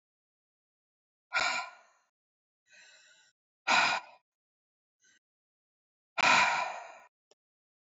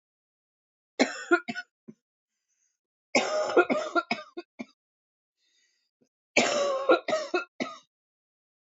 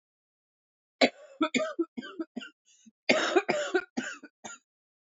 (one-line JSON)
{"exhalation_length": "7.9 s", "exhalation_amplitude": 9003, "exhalation_signal_mean_std_ratio": 0.31, "three_cough_length": "8.7 s", "three_cough_amplitude": 14395, "three_cough_signal_mean_std_ratio": 0.37, "cough_length": "5.1 s", "cough_amplitude": 18893, "cough_signal_mean_std_ratio": 0.38, "survey_phase": "beta (2021-08-13 to 2022-03-07)", "age": "45-64", "gender": "Female", "wearing_mask": "No", "symptom_cough_any": true, "symptom_runny_or_blocked_nose": true, "symptom_change_to_sense_of_smell_or_taste": true, "smoker_status": "Never smoked", "respiratory_condition_asthma": false, "respiratory_condition_other": false, "recruitment_source": "Test and Trace", "submission_delay": "1 day", "covid_test_result": "Positive", "covid_test_method": "RT-qPCR", "covid_ct_value": 14.9, "covid_ct_gene": "ORF1ab gene", "covid_ct_mean": 15.2, "covid_viral_load": "10000000 copies/ml", "covid_viral_load_category": "High viral load (>1M copies/ml)"}